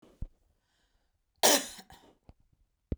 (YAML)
cough_length: 3.0 s
cough_amplitude: 12092
cough_signal_mean_std_ratio: 0.23
survey_phase: beta (2021-08-13 to 2022-03-07)
age: 45-64
gender: Female
wearing_mask: 'No'
symptom_runny_or_blocked_nose: true
symptom_onset: 8 days
smoker_status: Never smoked
respiratory_condition_asthma: false
respiratory_condition_other: false
recruitment_source: REACT
submission_delay: 1 day
covid_test_result: Negative
covid_test_method: RT-qPCR
influenza_a_test_result: Unknown/Void
influenza_b_test_result: Unknown/Void